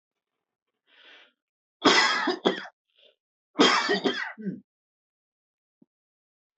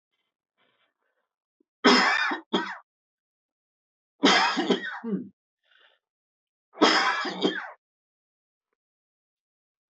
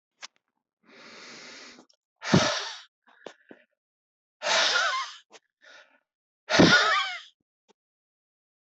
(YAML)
cough_length: 6.6 s
cough_amplitude: 19107
cough_signal_mean_std_ratio: 0.35
three_cough_length: 9.9 s
three_cough_amplitude: 19489
three_cough_signal_mean_std_ratio: 0.36
exhalation_length: 8.8 s
exhalation_amplitude: 19786
exhalation_signal_mean_std_ratio: 0.34
survey_phase: beta (2021-08-13 to 2022-03-07)
age: 45-64
gender: Male
wearing_mask: 'No'
symptom_runny_or_blocked_nose: true
symptom_onset: 4 days
smoker_status: Never smoked
respiratory_condition_asthma: false
respiratory_condition_other: false
recruitment_source: REACT
submission_delay: 5 days
covid_test_result: Negative
covid_test_method: RT-qPCR
influenza_a_test_result: Negative
influenza_b_test_result: Negative